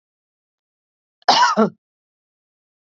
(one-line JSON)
{"cough_length": "2.8 s", "cough_amplitude": 29978, "cough_signal_mean_std_ratio": 0.29, "survey_phase": "beta (2021-08-13 to 2022-03-07)", "age": "45-64", "gender": "Female", "wearing_mask": "No", "symptom_cough_any": true, "symptom_runny_or_blocked_nose": true, "symptom_sore_throat": true, "smoker_status": "Ex-smoker", "respiratory_condition_asthma": false, "respiratory_condition_other": false, "recruitment_source": "REACT", "submission_delay": "1 day", "covid_test_result": "Negative", "covid_test_method": "RT-qPCR", "influenza_a_test_result": "Negative", "influenza_b_test_result": "Negative"}